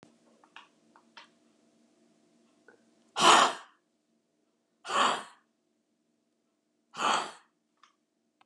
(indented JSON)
{
  "exhalation_length": "8.5 s",
  "exhalation_amplitude": 13700,
  "exhalation_signal_mean_std_ratio": 0.25,
  "survey_phase": "beta (2021-08-13 to 2022-03-07)",
  "age": "65+",
  "gender": "Female",
  "wearing_mask": "No",
  "symptom_cough_any": true,
  "symptom_runny_or_blocked_nose": true,
  "smoker_status": "Never smoked",
  "respiratory_condition_asthma": false,
  "respiratory_condition_other": true,
  "recruitment_source": "REACT",
  "submission_delay": "1 day",
  "covid_test_result": "Negative",
  "covid_test_method": "RT-qPCR",
  "influenza_a_test_result": "Unknown/Void",
  "influenza_b_test_result": "Unknown/Void"
}